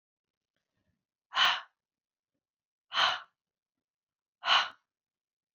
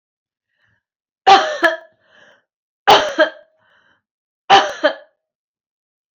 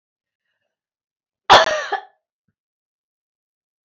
{"exhalation_length": "5.5 s", "exhalation_amplitude": 10149, "exhalation_signal_mean_std_ratio": 0.27, "three_cough_length": "6.1 s", "three_cough_amplitude": 30726, "three_cough_signal_mean_std_ratio": 0.31, "cough_length": "3.8 s", "cough_amplitude": 28911, "cough_signal_mean_std_ratio": 0.22, "survey_phase": "alpha (2021-03-01 to 2021-08-12)", "age": "65+", "gender": "Female", "wearing_mask": "No", "symptom_none": true, "smoker_status": "Ex-smoker", "respiratory_condition_asthma": false, "respiratory_condition_other": false, "recruitment_source": "REACT", "submission_delay": "1 day", "covid_test_result": "Negative", "covid_test_method": "RT-qPCR"}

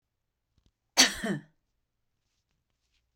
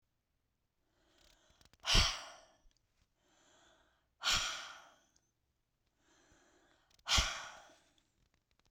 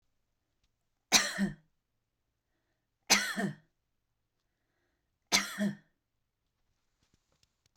{"cough_length": "3.2 s", "cough_amplitude": 17129, "cough_signal_mean_std_ratio": 0.21, "exhalation_length": "8.7 s", "exhalation_amplitude": 6999, "exhalation_signal_mean_std_ratio": 0.27, "three_cough_length": "7.8 s", "three_cough_amplitude": 11375, "three_cough_signal_mean_std_ratio": 0.27, "survey_phase": "beta (2021-08-13 to 2022-03-07)", "age": "45-64", "gender": "Female", "wearing_mask": "No", "symptom_fatigue": true, "symptom_onset": "12 days", "smoker_status": "Ex-smoker", "respiratory_condition_asthma": false, "respiratory_condition_other": false, "recruitment_source": "REACT", "submission_delay": "0 days", "covid_test_result": "Negative", "covid_test_method": "RT-qPCR"}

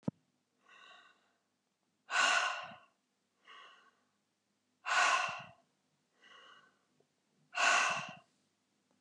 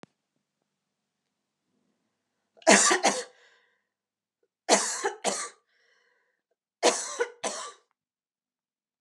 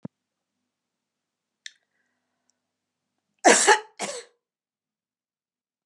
{"exhalation_length": "9.0 s", "exhalation_amplitude": 5041, "exhalation_signal_mean_std_ratio": 0.35, "three_cough_length": "9.0 s", "three_cough_amplitude": 18187, "three_cough_signal_mean_std_ratio": 0.29, "cough_length": "5.9 s", "cough_amplitude": 28432, "cough_signal_mean_std_ratio": 0.2, "survey_phase": "beta (2021-08-13 to 2022-03-07)", "age": "45-64", "gender": "Female", "wearing_mask": "No", "symptom_none": true, "smoker_status": "Never smoked", "respiratory_condition_asthma": false, "respiratory_condition_other": false, "recruitment_source": "REACT", "submission_delay": "2 days", "covid_test_result": "Negative", "covid_test_method": "RT-qPCR"}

